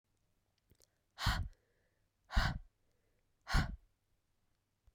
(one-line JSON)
{"exhalation_length": "4.9 s", "exhalation_amplitude": 3780, "exhalation_signal_mean_std_ratio": 0.29, "survey_phase": "beta (2021-08-13 to 2022-03-07)", "age": "18-44", "gender": "Female", "wearing_mask": "No", "symptom_cough_any": true, "symptom_runny_or_blocked_nose": true, "symptom_headache": true, "smoker_status": "Never smoked", "respiratory_condition_asthma": false, "respiratory_condition_other": false, "recruitment_source": "Test and Trace", "submission_delay": "2 days", "covid_test_result": "Positive", "covid_test_method": "RT-qPCR", "covid_ct_value": 15.6, "covid_ct_gene": "ORF1ab gene"}